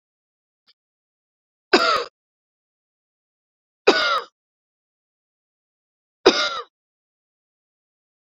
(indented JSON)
{
  "three_cough_length": "8.3 s",
  "three_cough_amplitude": 32768,
  "three_cough_signal_mean_std_ratio": 0.24,
  "survey_phase": "beta (2021-08-13 to 2022-03-07)",
  "age": "18-44",
  "gender": "Female",
  "wearing_mask": "No",
  "symptom_none": true,
  "smoker_status": "Ex-smoker",
  "respiratory_condition_asthma": false,
  "respiratory_condition_other": false,
  "recruitment_source": "REACT",
  "submission_delay": "1 day",
  "covid_test_result": "Negative",
  "covid_test_method": "RT-qPCR",
  "influenza_a_test_result": "Negative",
  "influenza_b_test_result": "Negative"
}